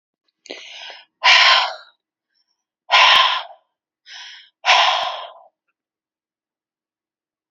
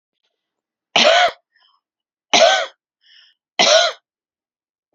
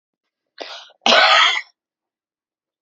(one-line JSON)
{"exhalation_length": "7.5 s", "exhalation_amplitude": 30986, "exhalation_signal_mean_std_ratio": 0.36, "three_cough_length": "4.9 s", "three_cough_amplitude": 30922, "three_cough_signal_mean_std_ratio": 0.37, "cough_length": "2.8 s", "cough_amplitude": 31085, "cough_signal_mean_std_ratio": 0.37, "survey_phase": "beta (2021-08-13 to 2022-03-07)", "age": "45-64", "gender": "Female", "wearing_mask": "No", "symptom_none": true, "symptom_onset": "7 days", "smoker_status": "Current smoker (1 to 10 cigarettes per day)", "respiratory_condition_asthma": false, "respiratory_condition_other": false, "recruitment_source": "REACT", "submission_delay": "11 days", "covid_test_result": "Negative", "covid_test_method": "RT-qPCR"}